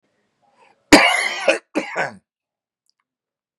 {"cough_length": "3.6 s", "cough_amplitude": 32768, "cough_signal_mean_std_ratio": 0.31, "survey_phase": "beta (2021-08-13 to 2022-03-07)", "age": "45-64", "gender": "Male", "wearing_mask": "No", "symptom_none": true, "smoker_status": "Ex-smoker", "respiratory_condition_asthma": false, "respiratory_condition_other": false, "recruitment_source": "REACT", "submission_delay": "1 day", "covid_test_result": "Negative", "covid_test_method": "RT-qPCR", "influenza_a_test_result": "Negative", "influenza_b_test_result": "Negative"}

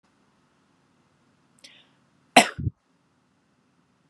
{"cough_length": "4.1 s", "cough_amplitude": 32414, "cough_signal_mean_std_ratio": 0.14, "survey_phase": "beta (2021-08-13 to 2022-03-07)", "age": "18-44", "gender": "Female", "wearing_mask": "No", "symptom_none": true, "smoker_status": "Never smoked", "respiratory_condition_asthma": false, "respiratory_condition_other": false, "recruitment_source": "REACT", "submission_delay": "5 days", "covid_test_result": "Negative", "covid_test_method": "RT-qPCR", "influenza_a_test_result": "Negative", "influenza_b_test_result": "Negative"}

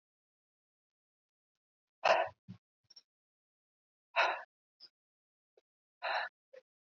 {"exhalation_length": "6.9 s", "exhalation_amplitude": 5364, "exhalation_signal_mean_std_ratio": 0.24, "survey_phase": "beta (2021-08-13 to 2022-03-07)", "age": "18-44", "gender": "Female", "wearing_mask": "No", "symptom_none": true, "smoker_status": "Never smoked", "respiratory_condition_asthma": false, "respiratory_condition_other": false, "recruitment_source": "REACT", "submission_delay": "2 days", "covid_test_result": "Negative", "covid_test_method": "RT-qPCR", "influenza_a_test_result": "Negative", "influenza_b_test_result": "Negative"}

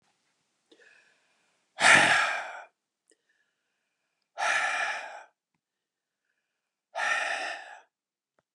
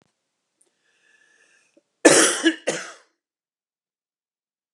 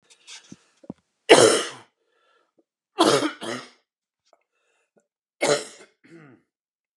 {"exhalation_length": "8.5 s", "exhalation_amplitude": 18401, "exhalation_signal_mean_std_ratio": 0.34, "cough_length": "4.7 s", "cough_amplitude": 31735, "cough_signal_mean_std_ratio": 0.25, "three_cough_length": "7.0 s", "three_cough_amplitude": 32767, "three_cough_signal_mean_std_ratio": 0.27, "survey_phase": "beta (2021-08-13 to 2022-03-07)", "age": "45-64", "gender": "Male", "wearing_mask": "No", "symptom_cough_any": true, "symptom_sore_throat": true, "symptom_onset": "12 days", "smoker_status": "Never smoked", "respiratory_condition_asthma": false, "respiratory_condition_other": false, "recruitment_source": "REACT", "submission_delay": "2 days", "covid_test_result": "Negative", "covid_test_method": "RT-qPCR", "influenza_a_test_result": "Negative", "influenza_b_test_result": "Negative"}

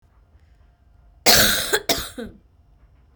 {"cough_length": "3.2 s", "cough_amplitude": 32768, "cough_signal_mean_std_ratio": 0.37, "survey_phase": "beta (2021-08-13 to 2022-03-07)", "age": "18-44", "gender": "Male", "wearing_mask": "Yes", "symptom_cough_any": true, "symptom_runny_or_blocked_nose": true, "symptom_sore_throat": true, "symptom_headache": true, "symptom_other": true, "symptom_onset": "8 days", "smoker_status": "Never smoked", "respiratory_condition_asthma": false, "respiratory_condition_other": false, "recruitment_source": "Test and Trace", "submission_delay": "4 days", "covid_test_result": "Positive", "covid_test_method": "RT-qPCR", "covid_ct_value": 22.3, "covid_ct_gene": "ORF1ab gene"}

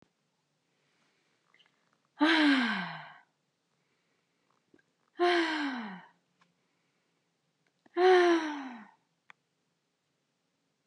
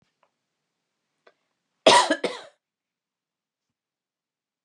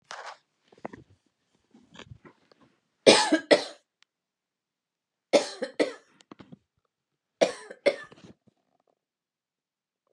{"exhalation_length": "10.9 s", "exhalation_amplitude": 8609, "exhalation_signal_mean_std_ratio": 0.34, "cough_length": "4.6 s", "cough_amplitude": 25977, "cough_signal_mean_std_ratio": 0.2, "three_cough_length": "10.1 s", "three_cough_amplitude": 30242, "three_cough_signal_mean_std_ratio": 0.22, "survey_phase": "beta (2021-08-13 to 2022-03-07)", "age": "45-64", "gender": "Female", "wearing_mask": "No", "symptom_headache": true, "symptom_onset": "11 days", "smoker_status": "Never smoked", "respiratory_condition_asthma": false, "respiratory_condition_other": false, "recruitment_source": "REACT", "submission_delay": "1 day", "covid_test_result": "Negative", "covid_test_method": "RT-qPCR", "influenza_a_test_result": "Negative", "influenza_b_test_result": "Negative"}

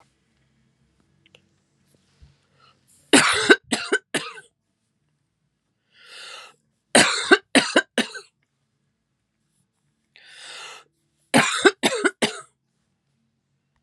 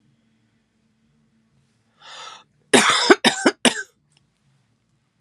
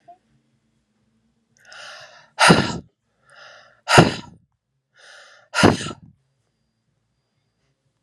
{"three_cough_length": "13.8 s", "three_cough_amplitude": 32767, "three_cough_signal_mean_std_ratio": 0.28, "cough_length": "5.2 s", "cough_amplitude": 32768, "cough_signal_mean_std_ratio": 0.28, "exhalation_length": "8.0 s", "exhalation_amplitude": 32768, "exhalation_signal_mean_std_ratio": 0.25, "survey_phase": "alpha (2021-03-01 to 2021-08-12)", "age": "45-64", "gender": "Female", "wearing_mask": "No", "symptom_fatigue": true, "symptom_headache": true, "symptom_change_to_sense_of_smell_or_taste": true, "symptom_onset": "6 days", "smoker_status": "Ex-smoker", "respiratory_condition_asthma": false, "respiratory_condition_other": false, "recruitment_source": "Test and Trace", "submission_delay": "2 days", "covid_test_result": "Positive", "covid_test_method": "RT-qPCR", "covid_ct_value": 25.2, "covid_ct_gene": "ORF1ab gene"}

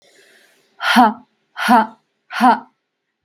{"exhalation_length": "3.2 s", "exhalation_amplitude": 32768, "exhalation_signal_mean_std_ratio": 0.38, "survey_phase": "beta (2021-08-13 to 2022-03-07)", "age": "18-44", "gender": "Female", "wearing_mask": "No", "symptom_shortness_of_breath": true, "symptom_fatigue": true, "symptom_onset": "12 days", "smoker_status": "Ex-smoker", "respiratory_condition_asthma": false, "respiratory_condition_other": false, "recruitment_source": "REACT", "submission_delay": "4 days", "covid_test_result": "Negative", "covid_test_method": "RT-qPCR", "influenza_a_test_result": "Negative", "influenza_b_test_result": "Negative"}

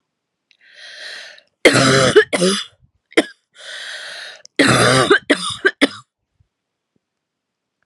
{"cough_length": "7.9 s", "cough_amplitude": 32768, "cough_signal_mean_std_ratio": 0.41, "survey_phase": "alpha (2021-03-01 to 2021-08-12)", "age": "18-44", "gender": "Female", "wearing_mask": "No", "symptom_change_to_sense_of_smell_or_taste": true, "symptom_loss_of_taste": true, "symptom_onset": "6 days", "smoker_status": "Never smoked", "respiratory_condition_asthma": false, "respiratory_condition_other": false, "recruitment_source": "Test and Trace", "submission_delay": "2 days", "covid_test_result": "Positive", "covid_test_method": "RT-qPCR", "covid_ct_value": 14.4, "covid_ct_gene": "N gene", "covid_ct_mean": 14.6, "covid_viral_load": "17000000 copies/ml", "covid_viral_load_category": "High viral load (>1M copies/ml)"}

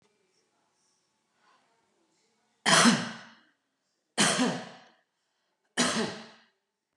{"three_cough_length": "7.0 s", "three_cough_amplitude": 12459, "three_cough_signal_mean_std_ratio": 0.32, "survey_phase": "beta (2021-08-13 to 2022-03-07)", "age": "45-64", "gender": "Female", "wearing_mask": "No", "symptom_none": true, "smoker_status": "Never smoked", "respiratory_condition_asthma": false, "respiratory_condition_other": false, "recruitment_source": "REACT", "submission_delay": "1 day", "covid_test_result": "Negative", "covid_test_method": "RT-qPCR", "influenza_a_test_result": "Negative", "influenza_b_test_result": "Negative"}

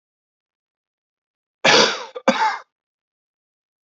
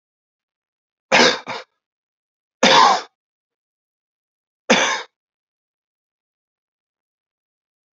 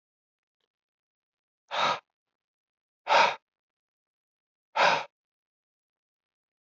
{"cough_length": "3.8 s", "cough_amplitude": 30659, "cough_signal_mean_std_ratio": 0.31, "three_cough_length": "7.9 s", "three_cough_amplitude": 32696, "three_cough_signal_mean_std_ratio": 0.27, "exhalation_length": "6.7 s", "exhalation_amplitude": 11546, "exhalation_signal_mean_std_ratio": 0.26, "survey_phase": "beta (2021-08-13 to 2022-03-07)", "age": "45-64", "gender": "Male", "wearing_mask": "No", "symptom_cough_any": true, "symptom_runny_or_blocked_nose": true, "smoker_status": "Never smoked", "respiratory_condition_asthma": false, "respiratory_condition_other": false, "recruitment_source": "Test and Trace", "submission_delay": "1 day", "covid_test_result": "Positive", "covid_test_method": "RT-qPCR", "covid_ct_value": 16.3, "covid_ct_gene": "ORF1ab gene", "covid_ct_mean": 16.5, "covid_viral_load": "3800000 copies/ml", "covid_viral_load_category": "High viral load (>1M copies/ml)"}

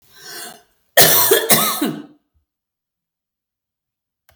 {"cough_length": "4.4 s", "cough_amplitude": 32768, "cough_signal_mean_std_ratio": 0.37, "survey_phase": "beta (2021-08-13 to 2022-03-07)", "age": "45-64", "gender": "Female", "wearing_mask": "No", "symptom_none": true, "smoker_status": "Never smoked", "respiratory_condition_asthma": true, "respiratory_condition_other": true, "recruitment_source": "REACT", "submission_delay": "21 days", "covid_test_result": "Negative", "covid_test_method": "RT-qPCR", "influenza_a_test_result": "Negative", "influenza_b_test_result": "Negative"}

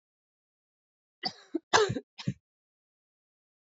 {"cough_length": "3.7 s", "cough_amplitude": 13706, "cough_signal_mean_std_ratio": 0.24, "survey_phase": "beta (2021-08-13 to 2022-03-07)", "age": "18-44", "gender": "Female", "wearing_mask": "No", "symptom_cough_any": true, "symptom_new_continuous_cough": true, "symptom_runny_or_blocked_nose": true, "symptom_shortness_of_breath": true, "symptom_fatigue": true, "symptom_headache": true, "symptom_change_to_sense_of_smell_or_taste": true, "symptom_loss_of_taste": true, "symptom_onset": "3 days", "smoker_status": "Never smoked", "respiratory_condition_asthma": true, "respiratory_condition_other": false, "recruitment_source": "Test and Trace", "submission_delay": "2 days", "covid_test_result": "Positive", "covid_test_method": "ePCR"}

